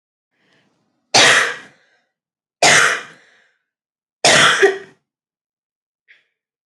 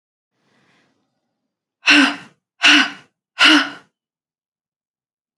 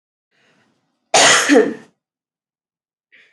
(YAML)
three_cough_length: 6.7 s
three_cough_amplitude: 32767
three_cough_signal_mean_std_ratio: 0.36
exhalation_length: 5.4 s
exhalation_amplitude: 32295
exhalation_signal_mean_std_ratio: 0.31
cough_length: 3.3 s
cough_amplitude: 31105
cough_signal_mean_std_ratio: 0.34
survey_phase: alpha (2021-03-01 to 2021-08-12)
age: 18-44
gender: Female
wearing_mask: 'No'
symptom_cough_any: true
symptom_fatigue: true
symptom_fever_high_temperature: true
symptom_headache: true
symptom_change_to_sense_of_smell_or_taste: true
symptom_loss_of_taste: true
symptom_onset: 3 days
smoker_status: Never smoked
respiratory_condition_asthma: false
respiratory_condition_other: false
recruitment_source: Test and Trace
submission_delay: 2 days
covid_test_result: Positive
covid_test_method: RT-qPCR